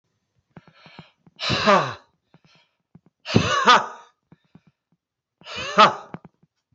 {"exhalation_length": "6.7 s", "exhalation_amplitude": 30812, "exhalation_signal_mean_std_ratio": 0.31, "survey_phase": "beta (2021-08-13 to 2022-03-07)", "age": "65+", "gender": "Male", "wearing_mask": "No", "symptom_none": true, "smoker_status": "Never smoked", "respiratory_condition_asthma": false, "respiratory_condition_other": false, "recruitment_source": "REACT", "submission_delay": "1 day", "covid_test_result": "Negative", "covid_test_method": "RT-qPCR"}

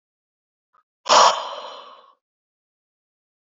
{"exhalation_length": "3.5 s", "exhalation_amplitude": 30449, "exhalation_signal_mean_std_ratio": 0.26, "survey_phase": "alpha (2021-03-01 to 2021-08-12)", "age": "18-44", "gender": "Male", "wearing_mask": "No", "symptom_abdominal_pain": true, "symptom_fatigue": true, "symptom_fever_high_temperature": true, "symptom_headache": true, "smoker_status": "Never smoked", "respiratory_condition_asthma": false, "respiratory_condition_other": false, "recruitment_source": "Test and Trace", "submission_delay": "2 days", "covid_test_result": "Positive", "covid_test_method": "RT-qPCR", "covid_ct_value": 15.5, "covid_ct_gene": "ORF1ab gene", "covid_ct_mean": 16.2, "covid_viral_load": "5000000 copies/ml", "covid_viral_load_category": "High viral load (>1M copies/ml)"}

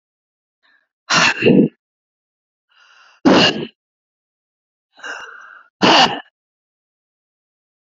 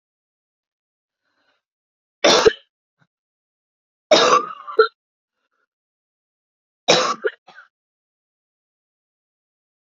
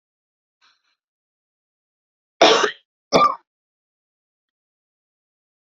{"exhalation_length": "7.9 s", "exhalation_amplitude": 29917, "exhalation_signal_mean_std_ratio": 0.33, "three_cough_length": "9.9 s", "three_cough_amplitude": 32767, "three_cough_signal_mean_std_ratio": 0.25, "cough_length": "5.6 s", "cough_amplitude": 32768, "cough_signal_mean_std_ratio": 0.23, "survey_phase": "beta (2021-08-13 to 2022-03-07)", "age": "18-44", "gender": "Female", "wearing_mask": "No", "symptom_cough_any": true, "symptom_new_continuous_cough": true, "symptom_runny_or_blocked_nose": true, "symptom_shortness_of_breath": true, "symptom_sore_throat": true, "symptom_fatigue": true, "symptom_fever_high_temperature": true, "symptom_headache": true, "smoker_status": "Ex-smoker", "respiratory_condition_asthma": false, "respiratory_condition_other": false, "recruitment_source": "Test and Trace", "submission_delay": "1 day", "covid_test_result": "Positive", "covid_test_method": "ePCR"}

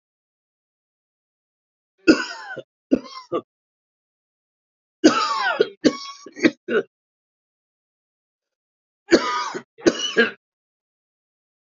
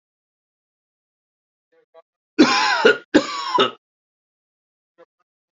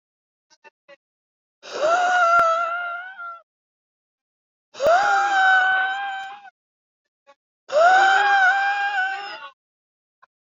{"three_cough_length": "11.7 s", "three_cough_amplitude": 32314, "three_cough_signal_mean_std_ratio": 0.3, "cough_length": "5.5 s", "cough_amplitude": 30547, "cough_signal_mean_std_ratio": 0.31, "exhalation_length": "10.6 s", "exhalation_amplitude": 20100, "exhalation_signal_mean_std_ratio": 0.56, "survey_phase": "alpha (2021-03-01 to 2021-08-12)", "age": "45-64", "gender": "Male", "wearing_mask": "No", "symptom_cough_any": true, "symptom_shortness_of_breath": true, "symptom_fatigue": true, "symptom_fever_high_temperature": true, "symptom_headache": true, "symptom_onset": "3 days", "smoker_status": "Current smoker (1 to 10 cigarettes per day)", "respiratory_condition_asthma": false, "respiratory_condition_other": false, "recruitment_source": "Test and Trace", "submission_delay": "2 days", "covid_test_result": "Positive", "covid_test_method": "RT-qPCR", "covid_ct_value": 20.0, "covid_ct_gene": "N gene"}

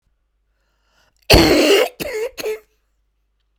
{"cough_length": "3.6 s", "cough_amplitude": 32768, "cough_signal_mean_std_ratio": 0.4, "survey_phase": "beta (2021-08-13 to 2022-03-07)", "age": "65+", "gender": "Female", "wearing_mask": "No", "symptom_cough_any": true, "symptom_runny_or_blocked_nose": true, "symptom_fatigue": true, "symptom_change_to_sense_of_smell_or_taste": true, "smoker_status": "Never smoked", "respiratory_condition_asthma": true, "respiratory_condition_other": false, "recruitment_source": "Test and Trace", "submission_delay": "2 days", "covid_test_result": "Positive", "covid_test_method": "LFT"}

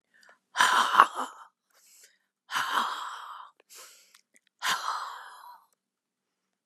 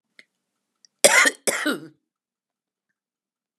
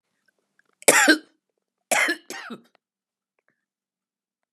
{"exhalation_length": "6.7 s", "exhalation_amplitude": 32036, "exhalation_signal_mean_std_ratio": 0.35, "cough_length": "3.6 s", "cough_amplitude": 32749, "cough_signal_mean_std_ratio": 0.27, "three_cough_length": "4.5 s", "three_cough_amplitude": 32197, "three_cough_signal_mean_std_ratio": 0.27, "survey_phase": "beta (2021-08-13 to 2022-03-07)", "age": "65+", "gender": "Female", "wearing_mask": "No", "symptom_cough_any": true, "symptom_runny_or_blocked_nose": true, "symptom_shortness_of_breath": true, "symptom_fatigue": true, "smoker_status": "Never smoked", "respiratory_condition_asthma": false, "respiratory_condition_other": true, "recruitment_source": "REACT", "submission_delay": "2 days", "covid_test_result": "Negative", "covid_test_method": "RT-qPCR", "influenza_a_test_result": "Negative", "influenza_b_test_result": "Negative"}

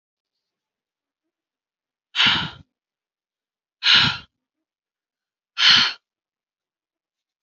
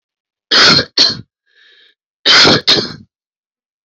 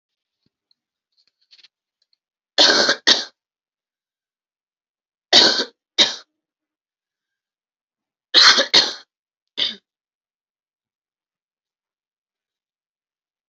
{"exhalation_length": "7.4 s", "exhalation_amplitude": 28614, "exhalation_signal_mean_std_ratio": 0.28, "cough_length": "3.8 s", "cough_amplitude": 32768, "cough_signal_mean_std_ratio": 0.45, "three_cough_length": "13.5 s", "three_cough_amplitude": 32768, "three_cough_signal_mean_std_ratio": 0.25, "survey_phase": "alpha (2021-03-01 to 2021-08-12)", "age": "45-64", "gender": "Female", "wearing_mask": "No", "symptom_new_continuous_cough": true, "symptom_onset": "6 days", "smoker_status": "Never smoked", "respiratory_condition_asthma": false, "respiratory_condition_other": false, "recruitment_source": "Test and Trace", "submission_delay": "2 days", "covid_test_result": "Positive", "covid_test_method": "RT-qPCR", "covid_ct_value": 30.7, "covid_ct_gene": "ORF1ab gene"}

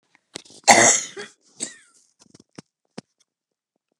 {"cough_length": "4.0 s", "cough_amplitude": 32768, "cough_signal_mean_std_ratio": 0.25, "survey_phase": "beta (2021-08-13 to 2022-03-07)", "age": "65+", "gender": "Female", "wearing_mask": "No", "symptom_cough_any": true, "smoker_status": "Never smoked", "respiratory_condition_asthma": false, "respiratory_condition_other": false, "recruitment_source": "REACT", "submission_delay": "1 day", "covid_test_result": "Negative", "covid_test_method": "RT-qPCR"}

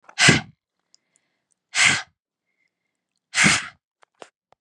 {"exhalation_length": "4.6 s", "exhalation_amplitude": 31836, "exhalation_signal_mean_std_ratio": 0.31, "survey_phase": "beta (2021-08-13 to 2022-03-07)", "age": "18-44", "gender": "Female", "wearing_mask": "No", "symptom_runny_or_blocked_nose": true, "symptom_sore_throat": true, "smoker_status": "Never smoked", "respiratory_condition_asthma": false, "respiratory_condition_other": false, "recruitment_source": "REACT", "submission_delay": "1 day", "covid_test_result": "Negative", "covid_test_method": "RT-qPCR", "influenza_a_test_result": "Negative", "influenza_b_test_result": "Negative"}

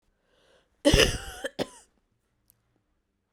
{"cough_length": "3.3 s", "cough_amplitude": 18072, "cough_signal_mean_std_ratio": 0.27, "survey_phase": "beta (2021-08-13 to 2022-03-07)", "age": "18-44", "gender": "Female", "wearing_mask": "No", "symptom_cough_any": true, "symptom_runny_or_blocked_nose": true, "symptom_shortness_of_breath": true, "symptom_sore_throat": true, "symptom_abdominal_pain": true, "symptom_fatigue": true, "symptom_fever_high_temperature": true, "symptom_headache": true, "symptom_change_to_sense_of_smell_or_taste": true, "symptom_loss_of_taste": true, "symptom_other": true, "symptom_onset": "3 days", "smoker_status": "Never smoked", "respiratory_condition_asthma": false, "respiratory_condition_other": false, "recruitment_source": "Test and Trace", "submission_delay": "2 days", "covid_test_result": "Positive", "covid_test_method": "RT-qPCR", "covid_ct_value": 15.1, "covid_ct_gene": "ORF1ab gene", "covid_ct_mean": 15.3, "covid_viral_load": "9800000 copies/ml", "covid_viral_load_category": "High viral load (>1M copies/ml)"}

